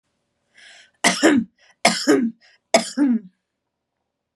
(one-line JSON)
{"three_cough_length": "4.4 s", "three_cough_amplitude": 32764, "three_cough_signal_mean_std_ratio": 0.41, "survey_phase": "beta (2021-08-13 to 2022-03-07)", "age": "18-44", "gender": "Female", "wearing_mask": "No", "symptom_sore_throat": true, "symptom_onset": "12 days", "smoker_status": "Current smoker (e-cigarettes or vapes only)", "respiratory_condition_asthma": false, "respiratory_condition_other": false, "recruitment_source": "REACT", "submission_delay": "1 day", "covid_test_result": "Negative", "covid_test_method": "RT-qPCR", "influenza_a_test_result": "Negative", "influenza_b_test_result": "Negative"}